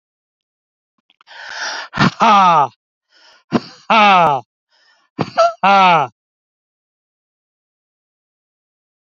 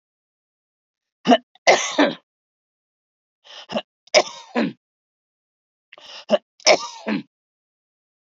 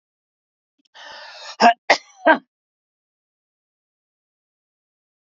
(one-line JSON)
{"exhalation_length": "9.0 s", "exhalation_amplitude": 28782, "exhalation_signal_mean_std_ratio": 0.39, "three_cough_length": "8.3 s", "three_cough_amplitude": 32767, "three_cough_signal_mean_std_ratio": 0.28, "cough_length": "5.2 s", "cough_amplitude": 28163, "cough_signal_mean_std_ratio": 0.2, "survey_phase": "beta (2021-08-13 to 2022-03-07)", "age": "65+", "gender": "Male", "wearing_mask": "No", "symptom_none": true, "smoker_status": "Never smoked", "respiratory_condition_asthma": false, "respiratory_condition_other": false, "recruitment_source": "REACT", "submission_delay": "1 day", "covid_test_result": "Negative", "covid_test_method": "RT-qPCR"}